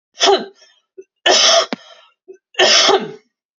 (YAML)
three_cough_length: 3.6 s
three_cough_amplitude: 32768
three_cough_signal_mean_std_ratio: 0.48
survey_phase: beta (2021-08-13 to 2022-03-07)
age: 18-44
gender: Female
wearing_mask: 'No'
symptom_runny_or_blocked_nose: true
smoker_status: Ex-smoker
respiratory_condition_asthma: false
respiratory_condition_other: false
recruitment_source: REACT
submission_delay: 1 day
covid_test_result: Negative
covid_test_method: RT-qPCR
influenza_a_test_result: Negative
influenza_b_test_result: Negative